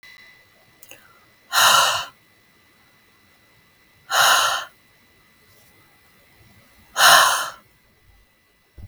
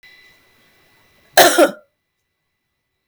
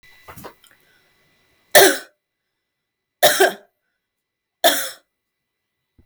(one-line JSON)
{"exhalation_length": "8.9 s", "exhalation_amplitude": 32768, "exhalation_signal_mean_std_ratio": 0.34, "cough_length": "3.1 s", "cough_amplitude": 32768, "cough_signal_mean_std_ratio": 0.26, "three_cough_length": "6.1 s", "three_cough_amplitude": 32768, "three_cough_signal_mean_std_ratio": 0.26, "survey_phase": "beta (2021-08-13 to 2022-03-07)", "age": "18-44", "gender": "Female", "wearing_mask": "No", "symptom_none": true, "smoker_status": "Never smoked", "respiratory_condition_asthma": false, "respiratory_condition_other": false, "recruitment_source": "REACT", "submission_delay": "2 days", "covid_test_result": "Negative", "covid_test_method": "RT-qPCR", "influenza_a_test_result": "Negative", "influenza_b_test_result": "Negative"}